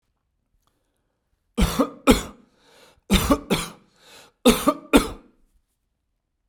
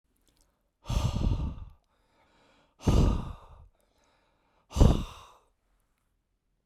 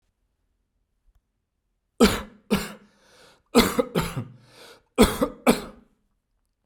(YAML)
three_cough_length: 6.5 s
three_cough_amplitude: 32767
three_cough_signal_mean_std_ratio: 0.31
exhalation_length: 6.7 s
exhalation_amplitude: 16525
exhalation_signal_mean_std_ratio: 0.34
cough_length: 6.7 s
cough_amplitude: 27426
cough_signal_mean_std_ratio: 0.3
survey_phase: beta (2021-08-13 to 2022-03-07)
age: 45-64
gender: Male
wearing_mask: 'Yes'
symptom_none: true
smoker_status: Never smoked
respiratory_condition_asthma: false
respiratory_condition_other: false
recruitment_source: REACT
submission_delay: 3 days
covid_test_result: Negative
covid_test_method: RT-qPCR
influenza_a_test_result: Negative
influenza_b_test_result: Negative